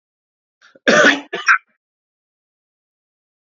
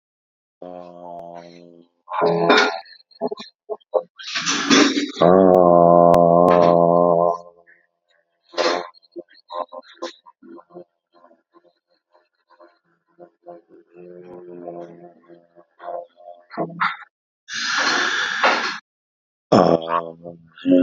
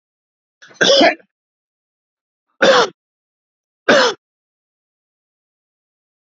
{"cough_length": "3.4 s", "cough_amplitude": 29504, "cough_signal_mean_std_ratio": 0.29, "exhalation_length": "20.8 s", "exhalation_amplitude": 28781, "exhalation_signal_mean_std_ratio": 0.42, "three_cough_length": "6.4 s", "three_cough_amplitude": 30361, "three_cough_signal_mean_std_ratio": 0.3, "survey_phase": "beta (2021-08-13 to 2022-03-07)", "age": "45-64", "gender": "Male", "wearing_mask": "No", "symptom_none": true, "smoker_status": "Ex-smoker", "respiratory_condition_asthma": false, "respiratory_condition_other": false, "recruitment_source": "REACT", "submission_delay": "1 day", "covid_test_result": "Negative", "covid_test_method": "RT-qPCR"}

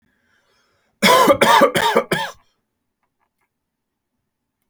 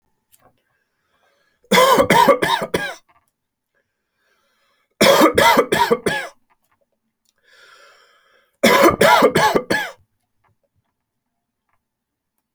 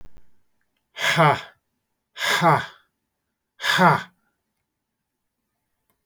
{"cough_length": "4.7 s", "cough_amplitude": 31253, "cough_signal_mean_std_ratio": 0.38, "three_cough_length": "12.5 s", "three_cough_amplitude": 32767, "three_cough_signal_mean_std_ratio": 0.4, "exhalation_length": "6.1 s", "exhalation_amplitude": 23606, "exhalation_signal_mean_std_ratio": 0.35, "survey_phase": "beta (2021-08-13 to 2022-03-07)", "age": "45-64", "gender": "Male", "wearing_mask": "No", "symptom_cough_any": true, "symptom_sore_throat": true, "symptom_fatigue": true, "symptom_headache": true, "smoker_status": "Never smoked", "respiratory_condition_asthma": false, "respiratory_condition_other": false, "recruitment_source": "Test and Trace", "submission_delay": "2 days", "covid_test_result": "Positive", "covid_test_method": "RT-qPCR", "covid_ct_value": 33.6, "covid_ct_gene": "ORF1ab gene", "covid_ct_mean": 34.6, "covid_viral_load": "4.3 copies/ml", "covid_viral_load_category": "Minimal viral load (< 10K copies/ml)"}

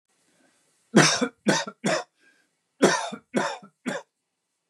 {"three_cough_length": "4.7 s", "three_cough_amplitude": 23780, "three_cough_signal_mean_std_ratio": 0.38, "survey_phase": "beta (2021-08-13 to 2022-03-07)", "age": "45-64", "gender": "Male", "wearing_mask": "No", "symptom_none": true, "smoker_status": "Never smoked", "respiratory_condition_asthma": false, "respiratory_condition_other": false, "recruitment_source": "REACT", "submission_delay": "4 days", "covid_test_result": "Negative", "covid_test_method": "RT-qPCR", "influenza_a_test_result": "Negative", "influenza_b_test_result": "Negative"}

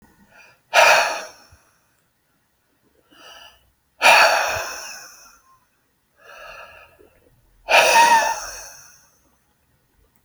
{"exhalation_length": "10.2 s", "exhalation_amplitude": 32767, "exhalation_signal_mean_std_ratio": 0.35, "survey_phase": "alpha (2021-03-01 to 2021-08-12)", "age": "45-64", "gender": "Male", "wearing_mask": "No", "symptom_none": true, "symptom_onset": "12 days", "smoker_status": "Ex-smoker", "respiratory_condition_asthma": false, "respiratory_condition_other": false, "recruitment_source": "REACT", "submission_delay": "1 day", "covid_test_result": "Negative", "covid_test_method": "RT-qPCR"}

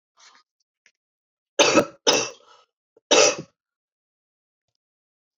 {"three_cough_length": "5.4 s", "three_cough_amplitude": 26182, "three_cough_signal_mean_std_ratio": 0.28, "survey_phase": "alpha (2021-03-01 to 2021-08-12)", "age": "18-44", "gender": "Female", "wearing_mask": "No", "symptom_fatigue": true, "symptom_headache": true, "symptom_change_to_sense_of_smell_or_taste": true, "symptom_loss_of_taste": true, "symptom_onset": "8 days", "smoker_status": "Never smoked", "respiratory_condition_asthma": true, "respiratory_condition_other": false, "recruitment_source": "Test and Trace", "submission_delay": "2 days", "covid_test_result": "Positive", "covid_test_method": "RT-qPCR", "covid_ct_value": 15.5, "covid_ct_gene": "ORF1ab gene", "covid_ct_mean": 15.6, "covid_viral_load": "7900000 copies/ml", "covid_viral_load_category": "High viral load (>1M copies/ml)"}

